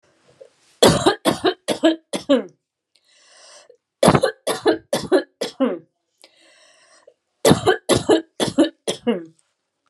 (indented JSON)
{
  "three_cough_length": "9.9 s",
  "three_cough_amplitude": 32734,
  "three_cough_signal_mean_std_ratio": 0.4,
  "survey_phase": "alpha (2021-03-01 to 2021-08-12)",
  "age": "45-64",
  "gender": "Female",
  "wearing_mask": "No",
  "symptom_none": true,
  "smoker_status": "Never smoked",
  "respiratory_condition_asthma": false,
  "respiratory_condition_other": false,
  "recruitment_source": "REACT",
  "submission_delay": "1 day",
  "covid_test_result": "Negative",
  "covid_test_method": "RT-qPCR",
  "covid_ct_value": 39.0,
  "covid_ct_gene": "N gene"
}